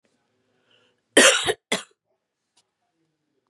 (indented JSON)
{
  "cough_length": "3.5 s",
  "cough_amplitude": 30666,
  "cough_signal_mean_std_ratio": 0.24,
  "survey_phase": "beta (2021-08-13 to 2022-03-07)",
  "age": "45-64",
  "gender": "Female",
  "wearing_mask": "No",
  "symptom_none": true,
  "smoker_status": "Ex-smoker",
  "respiratory_condition_asthma": true,
  "respiratory_condition_other": false,
  "recruitment_source": "REACT",
  "submission_delay": "1 day",
  "covid_test_result": "Negative",
  "covid_test_method": "RT-qPCR",
  "influenza_a_test_result": "Negative",
  "influenza_b_test_result": "Negative"
}